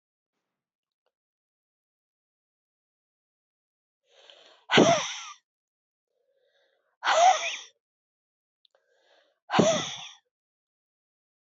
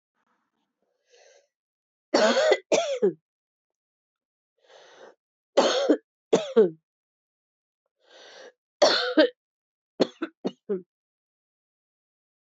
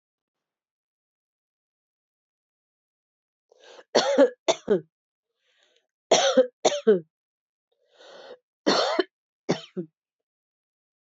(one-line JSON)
{"exhalation_length": "11.5 s", "exhalation_amplitude": 17305, "exhalation_signal_mean_std_ratio": 0.26, "three_cough_length": "12.5 s", "three_cough_amplitude": 16595, "three_cough_signal_mean_std_ratio": 0.32, "cough_length": "11.1 s", "cough_amplitude": 18506, "cough_signal_mean_std_ratio": 0.29, "survey_phase": "beta (2021-08-13 to 2022-03-07)", "age": "45-64", "gender": "Female", "wearing_mask": "No", "symptom_cough_any": true, "symptom_runny_or_blocked_nose": true, "symptom_fatigue": true, "symptom_onset": "9 days", "smoker_status": "Never smoked", "respiratory_condition_asthma": false, "respiratory_condition_other": false, "recruitment_source": "Test and Trace", "submission_delay": "1 day", "covid_test_result": "Positive", "covid_test_method": "RT-qPCR", "covid_ct_value": 21.1, "covid_ct_gene": "N gene"}